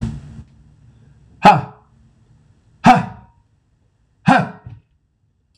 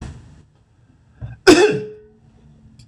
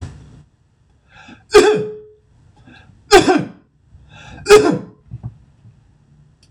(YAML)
exhalation_length: 5.6 s
exhalation_amplitude: 26028
exhalation_signal_mean_std_ratio: 0.28
cough_length: 2.9 s
cough_amplitude: 26028
cough_signal_mean_std_ratio: 0.31
three_cough_length: 6.5 s
three_cough_amplitude: 26028
three_cough_signal_mean_std_ratio: 0.33
survey_phase: beta (2021-08-13 to 2022-03-07)
age: 45-64
gender: Male
wearing_mask: 'No'
symptom_none: true
smoker_status: Never smoked
respiratory_condition_asthma: false
respiratory_condition_other: false
recruitment_source: REACT
submission_delay: 1 day
covid_test_result: Negative
covid_test_method: RT-qPCR
influenza_a_test_result: Negative
influenza_b_test_result: Negative